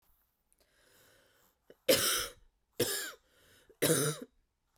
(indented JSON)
{
  "three_cough_length": "4.8 s",
  "three_cough_amplitude": 7281,
  "three_cough_signal_mean_std_ratio": 0.36,
  "survey_phase": "beta (2021-08-13 to 2022-03-07)",
  "age": "18-44",
  "gender": "Female",
  "wearing_mask": "No",
  "symptom_runny_or_blocked_nose": true,
  "symptom_sore_throat": true,
  "symptom_other": true,
  "smoker_status": "Never smoked",
  "respiratory_condition_asthma": false,
  "respiratory_condition_other": false,
  "recruitment_source": "Test and Trace",
  "submission_delay": "1 day",
  "covid_test_result": "Positive",
  "covid_test_method": "RT-qPCR",
  "covid_ct_value": 30.8,
  "covid_ct_gene": "N gene"
}